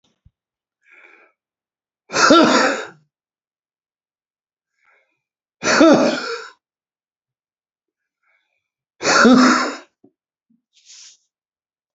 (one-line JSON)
{"three_cough_length": "11.9 s", "three_cough_amplitude": 29997, "three_cough_signal_mean_std_ratio": 0.32, "survey_phase": "beta (2021-08-13 to 2022-03-07)", "age": "65+", "gender": "Male", "wearing_mask": "No", "symptom_cough_any": true, "smoker_status": "Never smoked", "respiratory_condition_asthma": true, "respiratory_condition_other": false, "recruitment_source": "REACT", "submission_delay": "7 days", "covid_test_result": "Negative", "covid_test_method": "RT-qPCR", "influenza_a_test_result": "Negative", "influenza_b_test_result": "Negative"}